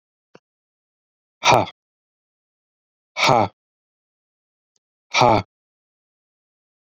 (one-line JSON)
{"exhalation_length": "6.8 s", "exhalation_amplitude": 32768, "exhalation_signal_mean_std_ratio": 0.25, "survey_phase": "beta (2021-08-13 to 2022-03-07)", "age": "45-64", "gender": "Male", "wearing_mask": "No", "symptom_none": true, "smoker_status": "Never smoked", "respiratory_condition_asthma": false, "respiratory_condition_other": false, "recruitment_source": "REACT", "submission_delay": "1 day", "covid_test_result": "Negative", "covid_test_method": "RT-qPCR"}